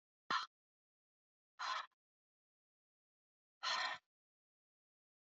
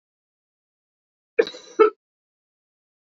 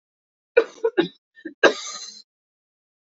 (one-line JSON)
{"exhalation_length": "5.4 s", "exhalation_amplitude": 1780, "exhalation_signal_mean_std_ratio": 0.28, "cough_length": "3.1 s", "cough_amplitude": 24776, "cough_signal_mean_std_ratio": 0.18, "three_cough_length": "3.2 s", "three_cough_amplitude": 27706, "three_cough_signal_mean_std_ratio": 0.27, "survey_phase": "beta (2021-08-13 to 2022-03-07)", "age": "18-44", "gender": "Female", "wearing_mask": "No", "symptom_new_continuous_cough": true, "symptom_sore_throat": true, "symptom_other": true, "symptom_onset": "12 days", "smoker_status": "Never smoked", "respiratory_condition_asthma": false, "respiratory_condition_other": false, "recruitment_source": "REACT", "submission_delay": "1 day", "covid_test_result": "Negative", "covid_test_method": "RT-qPCR"}